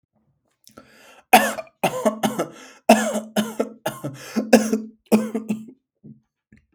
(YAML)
cough_length: 6.7 s
cough_amplitude: 32768
cough_signal_mean_std_ratio: 0.39
survey_phase: beta (2021-08-13 to 2022-03-07)
age: 18-44
gender: Male
wearing_mask: 'No'
symptom_none: true
smoker_status: Never smoked
respiratory_condition_asthma: false
respiratory_condition_other: false
recruitment_source: REACT
submission_delay: 4 days
covid_test_result: Negative
covid_test_method: RT-qPCR
influenza_a_test_result: Negative
influenza_b_test_result: Negative